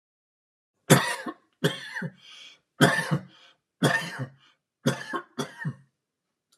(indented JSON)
{
  "three_cough_length": "6.6 s",
  "three_cough_amplitude": 25227,
  "three_cough_signal_mean_std_ratio": 0.36,
  "survey_phase": "alpha (2021-03-01 to 2021-08-12)",
  "age": "65+",
  "gender": "Male",
  "wearing_mask": "No",
  "symptom_none": true,
  "smoker_status": "Ex-smoker",
  "respiratory_condition_asthma": true,
  "respiratory_condition_other": false,
  "recruitment_source": "REACT",
  "submission_delay": "2 days",
  "covid_test_result": "Negative",
  "covid_test_method": "RT-qPCR"
}